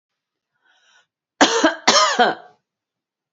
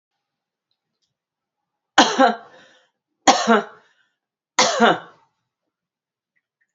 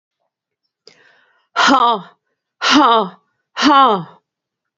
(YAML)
cough_length: 3.3 s
cough_amplitude: 32767
cough_signal_mean_std_ratio: 0.37
three_cough_length: 6.7 s
three_cough_amplitude: 32767
three_cough_signal_mean_std_ratio: 0.29
exhalation_length: 4.8 s
exhalation_amplitude: 29346
exhalation_signal_mean_std_ratio: 0.43
survey_phase: beta (2021-08-13 to 2022-03-07)
age: 45-64
gender: Female
wearing_mask: 'No'
symptom_runny_or_blocked_nose: true
symptom_sore_throat: true
symptom_fatigue: true
symptom_fever_high_temperature: true
symptom_headache: true
symptom_other: true
symptom_onset: 3 days
smoker_status: Ex-smoker
respiratory_condition_asthma: false
respiratory_condition_other: false
recruitment_source: Test and Trace
submission_delay: 2 days
covid_test_result: Positive
covid_test_method: RT-qPCR
covid_ct_value: 19.4
covid_ct_gene: ORF1ab gene
covid_ct_mean: 19.4
covid_viral_load: 420000 copies/ml
covid_viral_load_category: Low viral load (10K-1M copies/ml)